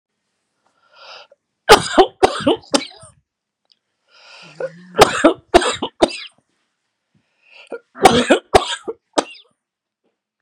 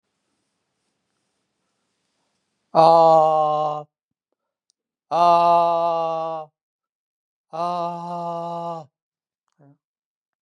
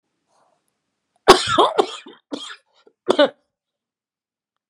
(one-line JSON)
{"three_cough_length": "10.4 s", "three_cough_amplitude": 32768, "three_cough_signal_mean_std_ratio": 0.3, "exhalation_length": "10.4 s", "exhalation_amplitude": 29455, "exhalation_signal_mean_std_ratio": 0.4, "cough_length": "4.7 s", "cough_amplitude": 32768, "cough_signal_mean_std_ratio": 0.27, "survey_phase": "beta (2021-08-13 to 2022-03-07)", "age": "65+", "gender": "Male", "wearing_mask": "No", "symptom_none": true, "smoker_status": "Never smoked", "respiratory_condition_asthma": false, "respiratory_condition_other": false, "recruitment_source": "REACT", "submission_delay": "1 day", "covid_test_result": "Negative", "covid_test_method": "RT-qPCR"}